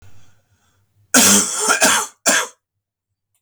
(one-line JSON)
{"cough_length": "3.4 s", "cough_amplitude": 32768, "cough_signal_mean_std_ratio": 0.47, "survey_phase": "beta (2021-08-13 to 2022-03-07)", "age": "45-64", "gender": "Male", "wearing_mask": "No", "symptom_cough_any": true, "symptom_runny_or_blocked_nose": true, "symptom_onset": "4 days", "smoker_status": "Never smoked", "respiratory_condition_asthma": false, "respiratory_condition_other": false, "recruitment_source": "Test and Trace", "submission_delay": "3 days", "covid_test_result": "Positive", "covid_test_method": "RT-qPCR", "covid_ct_value": 34.1, "covid_ct_gene": "N gene"}